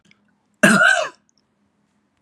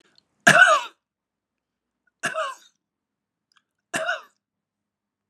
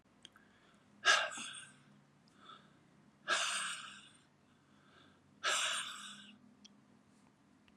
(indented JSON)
{
  "cough_length": "2.2 s",
  "cough_amplitude": 32767,
  "cough_signal_mean_std_ratio": 0.36,
  "three_cough_length": "5.3 s",
  "three_cough_amplitude": 31029,
  "three_cough_signal_mean_std_ratio": 0.26,
  "exhalation_length": "7.8 s",
  "exhalation_amplitude": 7230,
  "exhalation_signal_mean_std_ratio": 0.37,
  "survey_phase": "alpha (2021-03-01 to 2021-08-12)",
  "age": "45-64",
  "gender": "Male",
  "wearing_mask": "No",
  "symptom_none": true,
  "smoker_status": "Never smoked",
  "respiratory_condition_asthma": false,
  "respiratory_condition_other": false,
  "recruitment_source": "REACT",
  "submission_delay": "1 day",
  "covid_test_result": "Negative",
  "covid_test_method": "RT-qPCR"
}